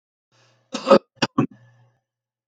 {
  "cough_length": "2.5 s",
  "cough_amplitude": 29399,
  "cough_signal_mean_std_ratio": 0.24,
  "survey_phase": "beta (2021-08-13 to 2022-03-07)",
  "age": "65+",
  "gender": "Male",
  "wearing_mask": "No",
  "symptom_cough_any": true,
  "smoker_status": "Ex-smoker",
  "respiratory_condition_asthma": false,
  "respiratory_condition_other": false,
  "recruitment_source": "REACT",
  "submission_delay": "5 days",
  "covid_test_result": "Negative",
  "covid_test_method": "RT-qPCR",
  "influenza_a_test_result": "Negative",
  "influenza_b_test_result": "Negative"
}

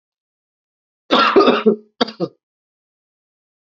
{
  "three_cough_length": "3.8 s",
  "three_cough_amplitude": 29369,
  "three_cough_signal_mean_std_ratio": 0.34,
  "survey_phase": "alpha (2021-03-01 to 2021-08-12)",
  "age": "18-44",
  "gender": "Male",
  "wearing_mask": "No",
  "symptom_cough_any": true,
  "symptom_fatigue": true,
  "symptom_headache": true,
  "symptom_onset": "3 days",
  "smoker_status": "Never smoked",
  "respiratory_condition_asthma": false,
  "respiratory_condition_other": false,
  "recruitment_source": "Test and Trace",
  "submission_delay": "1 day",
  "covid_test_result": "Positive",
  "covid_test_method": "RT-qPCR",
  "covid_ct_value": 18.7,
  "covid_ct_gene": "ORF1ab gene",
  "covid_ct_mean": 19.7,
  "covid_viral_load": "340000 copies/ml",
  "covid_viral_load_category": "Low viral load (10K-1M copies/ml)"
}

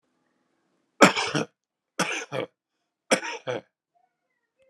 {
  "three_cough_length": "4.7 s",
  "three_cough_amplitude": 30584,
  "three_cough_signal_mean_std_ratio": 0.28,
  "survey_phase": "alpha (2021-03-01 to 2021-08-12)",
  "age": "45-64",
  "gender": "Male",
  "wearing_mask": "No",
  "symptom_none": true,
  "symptom_onset": "4 days",
  "smoker_status": "Never smoked",
  "respiratory_condition_asthma": true,
  "respiratory_condition_other": false,
  "recruitment_source": "REACT",
  "submission_delay": "1 day",
  "covid_test_result": "Negative",
  "covid_test_method": "RT-qPCR"
}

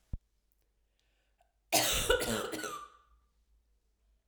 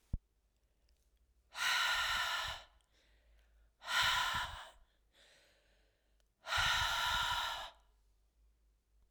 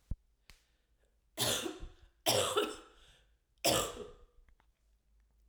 {
  "cough_length": "4.3 s",
  "cough_amplitude": 8756,
  "cough_signal_mean_std_ratio": 0.38,
  "exhalation_length": "9.1 s",
  "exhalation_amplitude": 3235,
  "exhalation_signal_mean_std_ratio": 0.5,
  "three_cough_length": "5.5 s",
  "three_cough_amplitude": 6050,
  "three_cough_signal_mean_std_ratio": 0.39,
  "survey_phase": "alpha (2021-03-01 to 2021-08-12)",
  "age": "45-64",
  "gender": "Female",
  "wearing_mask": "No",
  "symptom_cough_any": true,
  "symptom_fatigue": true,
  "symptom_headache": true,
  "symptom_change_to_sense_of_smell_or_taste": true,
  "symptom_loss_of_taste": true,
  "symptom_onset": "4 days",
  "smoker_status": "Never smoked",
  "respiratory_condition_asthma": false,
  "respiratory_condition_other": false,
  "recruitment_source": "Test and Trace",
  "submission_delay": "2 days",
  "covid_test_result": "Positive",
  "covid_test_method": "RT-qPCR",
  "covid_ct_value": 19.4,
  "covid_ct_gene": "ORF1ab gene",
  "covid_ct_mean": 20.1,
  "covid_viral_load": "260000 copies/ml",
  "covid_viral_load_category": "Low viral load (10K-1M copies/ml)"
}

